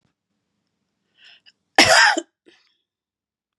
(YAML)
cough_length: 3.6 s
cough_amplitude: 32767
cough_signal_mean_std_ratio: 0.26
survey_phase: beta (2021-08-13 to 2022-03-07)
age: 45-64
gender: Female
wearing_mask: 'No'
symptom_none: true
smoker_status: Never smoked
respiratory_condition_asthma: false
respiratory_condition_other: false
recruitment_source: REACT
submission_delay: 32 days
covid_test_result: Negative
covid_test_method: RT-qPCR
influenza_a_test_result: Negative
influenza_b_test_result: Negative